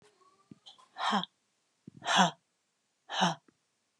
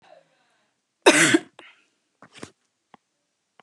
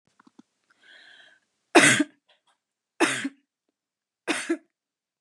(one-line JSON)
{"exhalation_length": "4.0 s", "exhalation_amplitude": 9555, "exhalation_signal_mean_std_ratio": 0.33, "cough_length": "3.6 s", "cough_amplitude": 30476, "cough_signal_mean_std_ratio": 0.24, "three_cough_length": "5.2 s", "three_cough_amplitude": 29157, "three_cough_signal_mean_std_ratio": 0.27, "survey_phase": "beta (2021-08-13 to 2022-03-07)", "age": "45-64", "gender": "Female", "wearing_mask": "No", "symptom_none": true, "smoker_status": "Never smoked", "respiratory_condition_asthma": false, "respiratory_condition_other": false, "recruitment_source": "Test and Trace", "submission_delay": "1 day", "covid_test_result": "Negative", "covid_test_method": "RT-qPCR"}